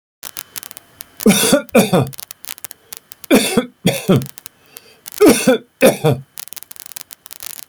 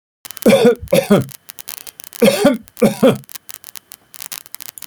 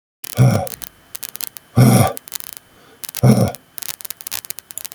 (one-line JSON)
{"three_cough_length": "7.7 s", "three_cough_amplitude": 32768, "three_cough_signal_mean_std_ratio": 0.41, "cough_length": "4.9 s", "cough_amplitude": 32768, "cough_signal_mean_std_ratio": 0.42, "exhalation_length": "4.9 s", "exhalation_amplitude": 32768, "exhalation_signal_mean_std_ratio": 0.37, "survey_phase": "alpha (2021-03-01 to 2021-08-12)", "age": "65+", "gender": "Male", "wearing_mask": "No", "symptom_none": true, "symptom_onset": "12 days", "smoker_status": "Ex-smoker", "respiratory_condition_asthma": false, "respiratory_condition_other": false, "recruitment_source": "REACT", "submission_delay": "3 days", "covid_test_method": "RT-qPCR"}